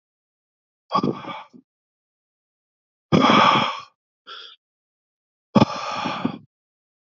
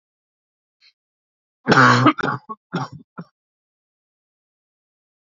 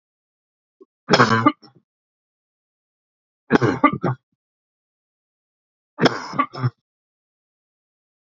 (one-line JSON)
{"exhalation_length": "7.1 s", "exhalation_amplitude": 26676, "exhalation_signal_mean_std_ratio": 0.34, "cough_length": "5.2 s", "cough_amplitude": 32768, "cough_signal_mean_std_ratio": 0.28, "three_cough_length": "8.3 s", "three_cough_amplitude": 32767, "three_cough_signal_mean_std_ratio": 0.28, "survey_phase": "beta (2021-08-13 to 2022-03-07)", "age": "45-64", "gender": "Male", "wearing_mask": "No", "symptom_cough_any": true, "symptom_runny_or_blocked_nose": true, "symptom_sore_throat": true, "smoker_status": "Never smoked", "respiratory_condition_asthma": false, "respiratory_condition_other": false, "recruitment_source": "Test and Trace", "submission_delay": "1 day", "covid_test_result": "Positive", "covid_test_method": "ePCR"}